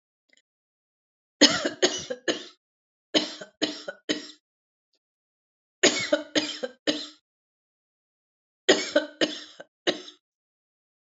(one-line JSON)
{"three_cough_length": "11.1 s", "three_cough_amplitude": 26872, "three_cough_signal_mean_std_ratio": 0.31, "survey_phase": "alpha (2021-03-01 to 2021-08-12)", "age": "45-64", "gender": "Female", "wearing_mask": "No", "symptom_none": true, "smoker_status": "Never smoked", "respiratory_condition_asthma": false, "respiratory_condition_other": false, "recruitment_source": "REACT", "submission_delay": "1 day", "covid_test_result": "Negative", "covid_test_method": "RT-qPCR"}